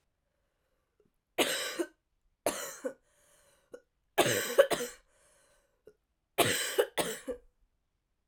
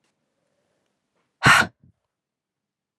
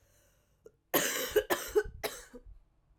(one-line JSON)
{"three_cough_length": "8.3 s", "three_cough_amplitude": 13000, "three_cough_signal_mean_std_ratio": 0.35, "exhalation_length": "3.0 s", "exhalation_amplitude": 25077, "exhalation_signal_mean_std_ratio": 0.21, "cough_length": "3.0 s", "cough_amplitude": 7395, "cough_signal_mean_std_ratio": 0.42, "survey_phase": "alpha (2021-03-01 to 2021-08-12)", "age": "18-44", "gender": "Female", "wearing_mask": "No", "symptom_cough_any": true, "symptom_new_continuous_cough": true, "symptom_fatigue": true, "symptom_fever_high_temperature": true, "symptom_headache": true, "symptom_change_to_sense_of_smell_or_taste": true, "symptom_loss_of_taste": true, "symptom_onset": "5 days", "smoker_status": "Never smoked", "respiratory_condition_asthma": false, "respiratory_condition_other": false, "recruitment_source": "Test and Trace", "submission_delay": "1 day", "covid_test_result": "Positive", "covid_test_method": "RT-qPCR", "covid_ct_value": 18.1, "covid_ct_gene": "S gene", "covid_ct_mean": 18.4, "covid_viral_load": "920000 copies/ml", "covid_viral_load_category": "Low viral load (10K-1M copies/ml)"}